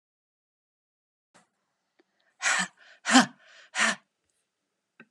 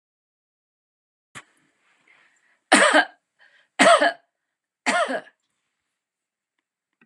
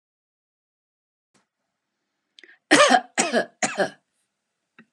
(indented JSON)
{
  "exhalation_length": "5.1 s",
  "exhalation_amplitude": 21739,
  "exhalation_signal_mean_std_ratio": 0.25,
  "three_cough_length": "7.1 s",
  "three_cough_amplitude": 30896,
  "three_cough_signal_mean_std_ratio": 0.28,
  "cough_length": "4.9 s",
  "cough_amplitude": 27609,
  "cough_signal_mean_std_ratio": 0.28,
  "survey_phase": "beta (2021-08-13 to 2022-03-07)",
  "age": "65+",
  "gender": "Female",
  "wearing_mask": "No",
  "symptom_none": true,
  "smoker_status": "Never smoked",
  "respiratory_condition_asthma": false,
  "respiratory_condition_other": false,
  "recruitment_source": "REACT",
  "submission_delay": "4 days",
  "covid_test_result": "Negative",
  "covid_test_method": "RT-qPCR",
  "influenza_a_test_result": "Negative",
  "influenza_b_test_result": "Negative"
}